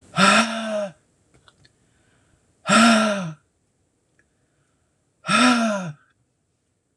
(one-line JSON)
{"exhalation_length": "7.0 s", "exhalation_amplitude": 25618, "exhalation_signal_mean_std_ratio": 0.41, "survey_phase": "beta (2021-08-13 to 2022-03-07)", "age": "45-64", "gender": "Female", "wearing_mask": "No", "symptom_none": true, "smoker_status": "Never smoked", "respiratory_condition_asthma": false, "respiratory_condition_other": false, "recruitment_source": "REACT", "submission_delay": "1 day", "covid_test_result": "Negative", "covid_test_method": "RT-qPCR"}